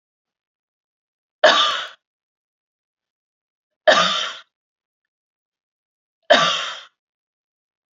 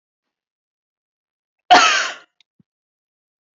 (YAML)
three_cough_length: 7.9 s
three_cough_amplitude: 32768
three_cough_signal_mean_std_ratio: 0.28
cough_length: 3.6 s
cough_amplitude: 28738
cough_signal_mean_std_ratio: 0.24
survey_phase: beta (2021-08-13 to 2022-03-07)
age: 45-64
gender: Female
wearing_mask: 'No'
symptom_none: true
smoker_status: Never smoked
respiratory_condition_asthma: false
respiratory_condition_other: false
recruitment_source: REACT
submission_delay: 2 days
covid_test_result: Negative
covid_test_method: RT-qPCR